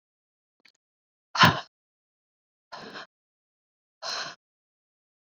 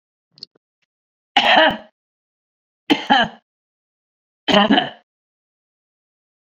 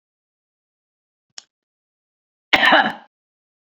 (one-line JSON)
{"exhalation_length": "5.3 s", "exhalation_amplitude": 19474, "exhalation_signal_mean_std_ratio": 0.19, "three_cough_length": "6.5 s", "three_cough_amplitude": 28816, "three_cough_signal_mean_std_ratio": 0.32, "cough_length": "3.7 s", "cough_amplitude": 28236, "cough_signal_mean_std_ratio": 0.25, "survey_phase": "beta (2021-08-13 to 2022-03-07)", "age": "45-64", "gender": "Female", "wearing_mask": "No", "symptom_none": true, "smoker_status": "Ex-smoker", "respiratory_condition_asthma": false, "respiratory_condition_other": false, "recruitment_source": "Test and Trace", "submission_delay": "1 day", "covid_test_result": "Negative", "covid_test_method": "RT-qPCR"}